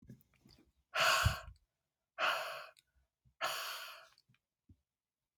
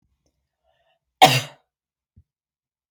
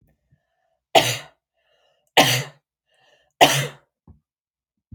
{
  "exhalation_length": "5.4 s",
  "exhalation_amplitude": 3799,
  "exhalation_signal_mean_std_ratio": 0.37,
  "cough_length": "2.9 s",
  "cough_amplitude": 30033,
  "cough_signal_mean_std_ratio": 0.18,
  "three_cough_length": "4.9 s",
  "three_cough_amplitude": 28756,
  "three_cough_signal_mean_std_ratio": 0.27,
  "survey_phase": "alpha (2021-03-01 to 2021-08-12)",
  "age": "45-64",
  "gender": "Female",
  "wearing_mask": "No",
  "symptom_none": true,
  "smoker_status": "Never smoked",
  "respiratory_condition_asthma": false,
  "respiratory_condition_other": false,
  "recruitment_source": "REACT",
  "submission_delay": "2 days",
  "covid_test_result": "Negative",
  "covid_test_method": "RT-qPCR"
}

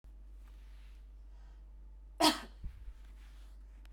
{
  "cough_length": "3.9 s",
  "cough_amplitude": 6721,
  "cough_signal_mean_std_ratio": 0.42,
  "survey_phase": "beta (2021-08-13 to 2022-03-07)",
  "age": "45-64",
  "gender": "Female",
  "wearing_mask": "No",
  "symptom_cough_any": true,
  "symptom_runny_or_blocked_nose": true,
  "symptom_fatigue": true,
  "symptom_fever_high_temperature": true,
  "symptom_headache": true,
  "symptom_change_to_sense_of_smell_or_taste": true,
  "symptom_other": true,
  "symptom_onset": "2 days",
  "smoker_status": "Ex-smoker",
  "respiratory_condition_asthma": false,
  "respiratory_condition_other": false,
  "recruitment_source": "Test and Trace",
  "submission_delay": "1 day",
  "covid_test_result": "Positive",
  "covid_test_method": "RT-qPCR",
  "covid_ct_value": 12.0,
  "covid_ct_gene": "ORF1ab gene",
  "covid_ct_mean": 12.5,
  "covid_viral_load": "82000000 copies/ml",
  "covid_viral_load_category": "High viral load (>1M copies/ml)"
}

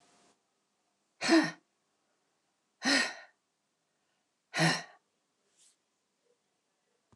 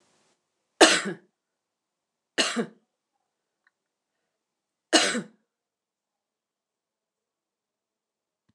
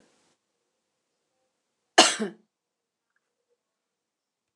{
  "exhalation_length": "7.2 s",
  "exhalation_amplitude": 7248,
  "exhalation_signal_mean_std_ratio": 0.26,
  "three_cough_length": "8.5 s",
  "three_cough_amplitude": 29203,
  "three_cough_signal_mean_std_ratio": 0.2,
  "cough_length": "4.6 s",
  "cough_amplitude": 28176,
  "cough_signal_mean_std_ratio": 0.15,
  "survey_phase": "alpha (2021-03-01 to 2021-08-12)",
  "age": "65+",
  "gender": "Female",
  "wearing_mask": "No",
  "symptom_none": true,
  "smoker_status": "Never smoked",
  "respiratory_condition_asthma": false,
  "respiratory_condition_other": false,
  "recruitment_source": "REACT",
  "submission_delay": "2 days",
  "covid_test_result": "Negative",
  "covid_test_method": "RT-qPCR"
}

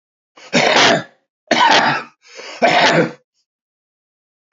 {
  "three_cough_length": "4.5 s",
  "three_cough_amplitude": 31260,
  "three_cough_signal_mean_std_ratio": 0.5,
  "survey_phase": "beta (2021-08-13 to 2022-03-07)",
  "age": "45-64",
  "gender": "Male",
  "wearing_mask": "No",
  "symptom_none": true,
  "smoker_status": "Current smoker (11 or more cigarettes per day)",
  "respiratory_condition_asthma": false,
  "respiratory_condition_other": false,
  "recruitment_source": "REACT",
  "submission_delay": "1 day",
  "covid_test_result": "Negative",
  "covid_test_method": "RT-qPCR",
  "influenza_a_test_result": "Negative",
  "influenza_b_test_result": "Negative"
}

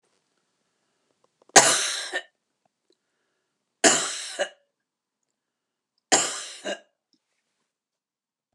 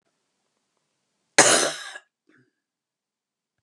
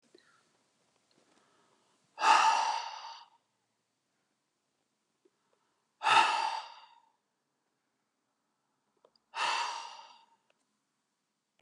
{
  "three_cough_length": "8.5 s",
  "three_cough_amplitude": 32767,
  "three_cough_signal_mean_std_ratio": 0.26,
  "cough_length": "3.6 s",
  "cough_amplitude": 31637,
  "cough_signal_mean_std_ratio": 0.24,
  "exhalation_length": "11.6 s",
  "exhalation_amplitude": 9364,
  "exhalation_signal_mean_std_ratio": 0.29,
  "survey_phase": "beta (2021-08-13 to 2022-03-07)",
  "age": "65+",
  "gender": "Female",
  "wearing_mask": "No",
  "symptom_cough_any": true,
  "symptom_fatigue": true,
  "symptom_other": true,
  "symptom_onset": "12 days",
  "smoker_status": "Never smoked",
  "respiratory_condition_asthma": false,
  "respiratory_condition_other": false,
  "recruitment_source": "REACT",
  "submission_delay": "2 days",
  "covid_test_result": "Negative",
  "covid_test_method": "RT-qPCR",
  "influenza_a_test_result": "Negative",
  "influenza_b_test_result": "Negative"
}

